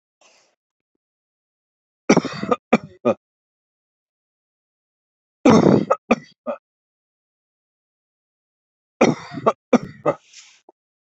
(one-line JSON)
{"three_cough_length": "11.2 s", "three_cough_amplitude": 27618, "three_cough_signal_mean_std_ratio": 0.26, "survey_phase": "beta (2021-08-13 to 2022-03-07)", "age": "45-64", "gender": "Male", "wearing_mask": "No", "symptom_shortness_of_breath": true, "symptom_headache": true, "symptom_onset": "12 days", "smoker_status": "Never smoked", "respiratory_condition_asthma": false, "respiratory_condition_other": false, "recruitment_source": "REACT", "submission_delay": "3 days", "covid_test_result": "Negative", "covid_test_method": "RT-qPCR", "influenza_a_test_result": "Negative", "influenza_b_test_result": "Negative"}